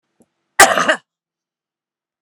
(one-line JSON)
{"cough_length": "2.2 s", "cough_amplitude": 32768, "cough_signal_mean_std_ratio": 0.27, "survey_phase": "alpha (2021-03-01 to 2021-08-12)", "age": "65+", "gender": "Female", "wearing_mask": "No", "symptom_none": true, "smoker_status": "Ex-smoker", "respiratory_condition_asthma": false, "respiratory_condition_other": false, "recruitment_source": "REACT", "submission_delay": "1 day", "covid_test_result": "Negative", "covid_test_method": "RT-qPCR"}